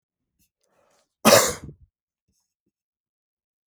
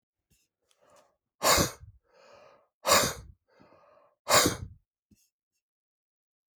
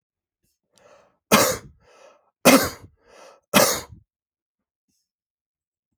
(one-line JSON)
{"cough_length": "3.7 s", "cough_amplitude": 30144, "cough_signal_mean_std_ratio": 0.21, "exhalation_length": "6.6 s", "exhalation_amplitude": 14234, "exhalation_signal_mean_std_ratio": 0.28, "three_cough_length": "6.0 s", "three_cough_amplitude": 32575, "three_cough_signal_mean_std_ratio": 0.26, "survey_phase": "alpha (2021-03-01 to 2021-08-12)", "age": "65+", "gender": "Male", "wearing_mask": "No", "symptom_none": true, "smoker_status": "Current smoker (1 to 10 cigarettes per day)", "respiratory_condition_asthma": false, "respiratory_condition_other": false, "recruitment_source": "REACT", "submission_delay": "2 days", "covid_test_result": "Negative", "covid_test_method": "RT-qPCR"}